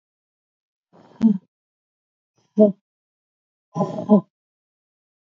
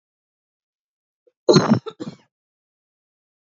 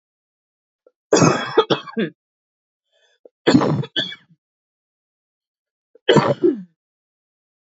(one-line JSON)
{"exhalation_length": "5.3 s", "exhalation_amplitude": 24058, "exhalation_signal_mean_std_ratio": 0.25, "cough_length": "3.5 s", "cough_amplitude": 28312, "cough_signal_mean_std_ratio": 0.23, "three_cough_length": "7.8 s", "three_cough_amplitude": 28095, "three_cough_signal_mean_std_ratio": 0.33, "survey_phase": "alpha (2021-03-01 to 2021-08-12)", "age": "18-44", "gender": "Female", "wearing_mask": "No", "symptom_none": true, "symptom_onset": "4 days", "smoker_status": "Never smoked", "respiratory_condition_asthma": false, "respiratory_condition_other": false, "recruitment_source": "REACT", "submission_delay": "2 days", "covid_test_result": "Negative", "covid_test_method": "RT-qPCR"}